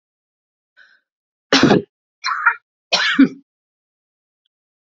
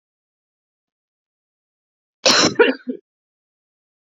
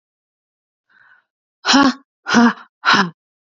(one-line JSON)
{"three_cough_length": "4.9 s", "three_cough_amplitude": 32295, "three_cough_signal_mean_std_ratio": 0.32, "cough_length": "4.2 s", "cough_amplitude": 30956, "cough_signal_mean_std_ratio": 0.26, "exhalation_length": "3.6 s", "exhalation_amplitude": 30245, "exhalation_signal_mean_std_ratio": 0.37, "survey_phase": "beta (2021-08-13 to 2022-03-07)", "age": "18-44", "gender": "Female", "wearing_mask": "No", "symptom_none": true, "smoker_status": "Never smoked", "respiratory_condition_asthma": false, "respiratory_condition_other": false, "recruitment_source": "REACT", "submission_delay": "1 day", "covid_test_result": "Negative", "covid_test_method": "RT-qPCR", "influenza_a_test_result": "Negative", "influenza_b_test_result": "Negative"}